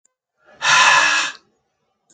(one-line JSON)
{"exhalation_length": "2.1 s", "exhalation_amplitude": 28444, "exhalation_signal_mean_std_ratio": 0.48, "survey_phase": "beta (2021-08-13 to 2022-03-07)", "age": "18-44", "gender": "Male", "wearing_mask": "No", "symptom_none": true, "smoker_status": "Never smoked", "respiratory_condition_asthma": true, "respiratory_condition_other": false, "recruitment_source": "Test and Trace", "submission_delay": "0 days", "covid_test_result": "Negative", "covid_test_method": "LAMP"}